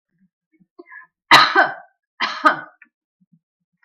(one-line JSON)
{"cough_length": "3.8 s", "cough_amplitude": 32768, "cough_signal_mean_std_ratio": 0.3, "survey_phase": "beta (2021-08-13 to 2022-03-07)", "age": "65+", "gender": "Female", "wearing_mask": "No", "symptom_none": true, "smoker_status": "Never smoked", "respiratory_condition_asthma": false, "respiratory_condition_other": false, "recruitment_source": "REACT", "submission_delay": "6 days", "covid_test_result": "Negative", "covid_test_method": "RT-qPCR"}